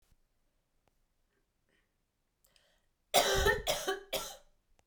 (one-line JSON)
{"cough_length": "4.9 s", "cough_amplitude": 8344, "cough_signal_mean_std_ratio": 0.33, "survey_phase": "beta (2021-08-13 to 2022-03-07)", "age": "18-44", "gender": "Female", "wearing_mask": "No", "symptom_cough_any": true, "symptom_new_continuous_cough": true, "symptom_onset": "4 days", "smoker_status": "Never smoked", "respiratory_condition_asthma": false, "respiratory_condition_other": false, "recruitment_source": "REACT", "submission_delay": "1 day", "covid_test_result": "Negative", "covid_test_method": "RT-qPCR"}